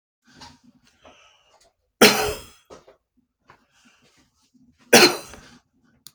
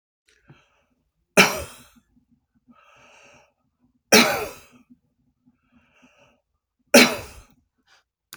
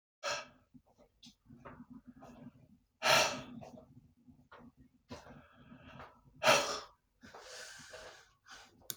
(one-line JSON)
{"cough_length": "6.1 s", "cough_amplitude": 32767, "cough_signal_mean_std_ratio": 0.22, "three_cough_length": "8.4 s", "three_cough_amplitude": 31811, "three_cough_signal_mean_std_ratio": 0.22, "exhalation_length": "9.0 s", "exhalation_amplitude": 6836, "exhalation_signal_mean_std_ratio": 0.31, "survey_phase": "beta (2021-08-13 to 2022-03-07)", "age": "65+", "gender": "Male", "wearing_mask": "No", "symptom_none": true, "symptom_onset": "4 days", "smoker_status": "Never smoked", "respiratory_condition_asthma": false, "respiratory_condition_other": false, "recruitment_source": "Test and Trace", "submission_delay": "2 days", "covid_test_result": "Negative", "covid_test_method": "RT-qPCR"}